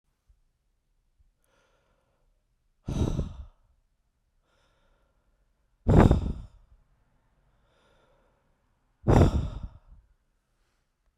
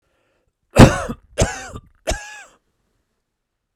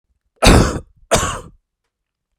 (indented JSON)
{
  "exhalation_length": "11.2 s",
  "exhalation_amplitude": 19854,
  "exhalation_signal_mean_std_ratio": 0.25,
  "three_cough_length": "3.8 s",
  "three_cough_amplitude": 32768,
  "three_cough_signal_mean_std_ratio": 0.25,
  "cough_length": "2.4 s",
  "cough_amplitude": 32768,
  "cough_signal_mean_std_ratio": 0.37,
  "survey_phase": "beta (2021-08-13 to 2022-03-07)",
  "age": "45-64",
  "gender": "Male",
  "wearing_mask": "No",
  "symptom_cough_any": true,
  "symptom_new_continuous_cough": true,
  "symptom_runny_or_blocked_nose": true,
  "symptom_shortness_of_breath": true,
  "symptom_fatigue": true,
  "symptom_headache": true,
  "symptom_change_to_sense_of_smell_or_taste": true,
  "symptom_other": true,
  "symptom_onset": "3 days",
  "smoker_status": "Never smoked",
  "respiratory_condition_asthma": false,
  "respiratory_condition_other": false,
  "recruitment_source": "Test and Trace",
  "submission_delay": "2 days",
  "covid_test_result": "Positive",
  "covid_test_method": "RT-qPCR",
  "covid_ct_value": 17.5,
  "covid_ct_gene": "ORF1ab gene"
}